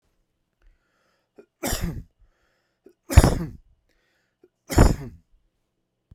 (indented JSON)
{
  "three_cough_length": "6.1 s",
  "three_cough_amplitude": 32767,
  "three_cough_signal_mean_std_ratio": 0.24,
  "survey_phase": "beta (2021-08-13 to 2022-03-07)",
  "age": "45-64",
  "gender": "Male",
  "wearing_mask": "No",
  "symptom_cough_any": true,
  "symptom_runny_or_blocked_nose": true,
  "symptom_sore_throat": true,
  "symptom_abdominal_pain": true,
  "symptom_fatigue": true,
  "symptom_headache": true,
  "smoker_status": "Ex-smoker",
  "respiratory_condition_asthma": false,
  "respiratory_condition_other": false,
  "recruitment_source": "Test and Trace",
  "submission_delay": "1 day",
  "covid_test_result": "Positive",
  "covid_test_method": "RT-qPCR",
  "covid_ct_value": 13.5,
  "covid_ct_gene": "S gene",
  "covid_ct_mean": 13.5,
  "covid_viral_load": "36000000 copies/ml",
  "covid_viral_load_category": "High viral load (>1M copies/ml)"
}